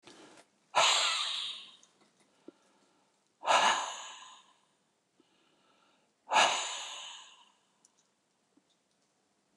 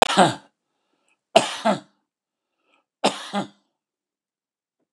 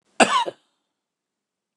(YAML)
exhalation_length: 9.6 s
exhalation_amplitude: 8073
exhalation_signal_mean_std_ratio: 0.35
three_cough_length: 4.9 s
three_cough_amplitude: 29204
three_cough_signal_mean_std_ratio: 0.28
cough_length: 1.8 s
cough_amplitude: 29204
cough_signal_mean_std_ratio: 0.27
survey_phase: beta (2021-08-13 to 2022-03-07)
age: 45-64
gender: Male
wearing_mask: 'No'
symptom_none: true
smoker_status: Ex-smoker
respiratory_condition_asthma: false
respiratory_condition_other: false
recruitment_source: REACT
submission_delay: 1 day
covid_test_result: Negative
covid_test_method: RT-qPCR
influenza_a_test_result: Unknown/Void
influenza_b_test_result: Unknown/Void